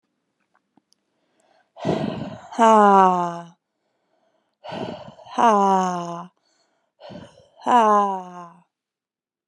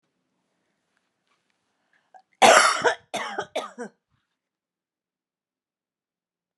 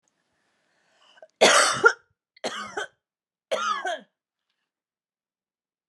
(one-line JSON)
{"exhalation_length": "9.5 s", "exhalation_amplitude": 28775, "exhalation_signal_mean_std_ratio": 0.38, "cough_length": "6.6 s", "cough_amplitude": 29713, "cough_signal_mean_std_ratio": 0.24, "three_cough_length": "5.9 s", "three_cough_amplitude": 24073, "three_cough_signal_mean_std_ratio": 0.3, "survey_phase": "beta (2021-08-13 to 2022-03-07)", "age": "18-44", "gender": "Female", "wearing_mask": "No", "symptom_runny_or_blocked_nose": true, "symptom_sore_throat": true, "symptom_abdominal_pain": true, "symptom_headache": true, "symptom_change_to_sense_of_smell_or_taste": true, "symptom_other": true, "smoker_status": "Current smoker (1 to 10 cigarettes per day)", "respiratory_condition_asthma": false, "respiratory_condition_other": false, "recruitment_source": "Test and Trace", "submission_delay": "2 days", "covid_test_result": "Positive", "covid_test_method": "LFT"}